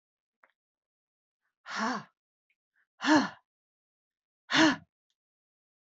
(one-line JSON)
{"exhalation_length": "6.0 s", "exhalation_amplitude": 11218, "exhalation_signal_mean_std_ratio": 0.26, "survey_phase": "alpha (2021-03-01 to 2021-08-12)", "age": "45-64", "gender": "Female", "wearing_mask": "No", "symptom_none": true, "smoker_status": "Never smoked", "respiratory_condition_asthma": false, "respiratory_condition_other": false, "recruitment_source": "REACT", "submission_delay": "2 days", "covid_test_result": "Negative", "covid_test_method": "RT-qPCR"}